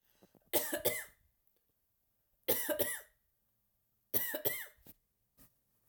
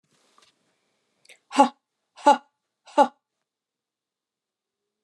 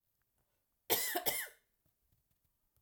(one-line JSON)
{"three_cough_length": "5.9 s", "three_cough_amplitude": 5032, "three_cough_signal_mean_std_ratio": 0.37, "exhalation_length": "5.0 s", "exhalation_amplitude": 27521, "exhalation_signal_mean_std_ratio": 0.19, "cough_length": "2.8 s", "cough_amplitude": 4102, "cough_signal_mean_std_ratio": 0.33, "survey_phase": "alpha (2021-03-01 to 2021-08-12)", "age": "45-64", "gender": "Female", "wearing_mask": "No", "symptom_headache": true, "symptom_change_to_sense_of_smell_or_taste": true, "symptom_loss_of_taste": true, "symptom_onset": "7 days", "smoker_status": "Never smoked", "respiratory_condition_asthma": false, "respiratory_condition_other": false, "recruitment_source": "Test and Trace", "submission_delay": "2 days", "covid_test_result": "Positive", "covid_test_method": "RT-qPCR", "covid_ct_value": 13.6, "covid_ct_gene": "ORF1ab gene", "covid_ct_mean": 13.9, "covid_viral_load": "28000000 copies/ml", "covid_viral_load_category": "High viral load (>1M copies/ml)"}